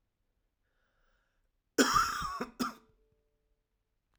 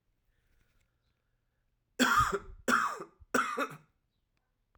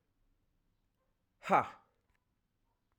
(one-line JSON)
{"cough_length": "4.2 s", "cough_amplitude": 9615, "cough_signal_mean_std_ratio": 0.31, "three_cough_length": "4.8 s", "three_cough_amplitude": 7219, "three_cough_signal_mean_std_ratio": 0.37, "exhalation_length": "3.0 s", "exhalation_amplitude": 5937, "exhalation_signal_mean_std_ratio": 0.19, "survey_phase": "alpha (2021-03-01 to 2021-08-12)", "age": "18-44", "gender": "Male", "wearing_mask": "No", "symptom_cough_any": true, "symptom_shortness_of_breath": true, "symptom_fatigue": true, "symptom_headache": true, "symptom_change_to_sense_of_smell_or_taste": true, "symptom_loss_of_taste": true, "symptom_onset": "3 days", "smoker_status": "Never smoked", "respiratory_condition_asthma": true, "respiratory_condition_other": false, "recruitment_source": "Test and Trace", "submission_delay": "2 days", "covid_test_result": "Positive", "covid_test_method": "RT-qPCR", "covid_ct_value": 21.4, "covid_ct_gene": "ORF1ab gene"}